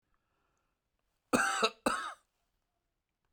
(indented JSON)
{
  "cough_length": "3.3 s",
  "cough_amplitude": 7502,
  "cough_signal_mean_std_ratio": 0.32,
  "survey_phase": "alpha (2021-03-01 to 2021-08-12)",
  "age": "65+",
  "gender": "Male",
  "wearing_mask": "No",
  "symptom_none": true,
  "smoker_status": "Ex-smoker",
  "respiratory_condition_asthma": false,
  "respiratory_condition_other": false,
  "recruitment_source": "REACT",
  "submission_delay": "4 days",
  "covid_test_result": "Negative",
  "covid_test_method": "RT-qPCR"
}